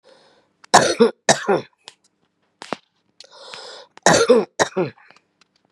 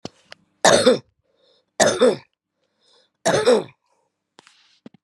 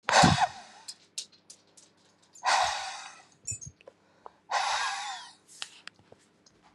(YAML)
cough_length: 5.7 s
cough_amplitude: 32768
cough_signal_mean_std_ratio: 0.34
three_cough_length: 5.0 s
three_cough_amplitude: 32229
three_cough_signal_mean_std_ratio: 0.36
exhalation_length: 6.7 s
exhalation_amplitude: 15868
exhalation_signal_mean_std_ratio: 0.38
survey_phase: beta (2021-08-13 to 2022-03-07)
age: 45-64
gender: Female
wearing_mask: 'No'
symptom_none: true
smoker_status: Current smoker (11 or more cigarettes per day)
respiratory_condition_asthma: false
respiratory_condition_other: false
recruitment_source: REACT
submission_delay: 3 days
covid_test_result: Negative
covid_test_method: RT-qPCR
influenza_a_test_result: Negative
influenza_b_test_result: Negative